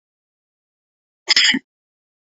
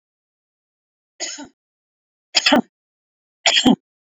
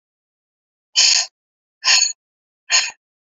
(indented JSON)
{
  "cough_length": "2.2 s",
  "cough_amplitude": 31272,
  "cough_signal_mean_std_ratio": 0.27,
  "three_cough_length": "4.2 s",
  "three_cough_amplitude": 32768,
  "three_cough_signal_mean_std_ratio": 0.28,
  "exhalation_length": "3.3 s",
  "exhalation_amplitude": 29233,
  "exhalation_signal_mean_std_ratio": 0.37,
  "survey_phase": "beta (2021-08-13 to 2022-03-07)",
  "age": "45-64",
  "gender": "Female",
  "wearing_mask": "No",
  "symptom_none": true,
  "smoker_status": "Never smoked",
  "respiratory_condition_asthma": false,
  "respiratory_condition_other": false,
  "recruitment_source": "REACT",
  "submission_delay": "3 days",
  "covid_test_result": "Negative",
  "covid_test_method": "RT-qPCR"
}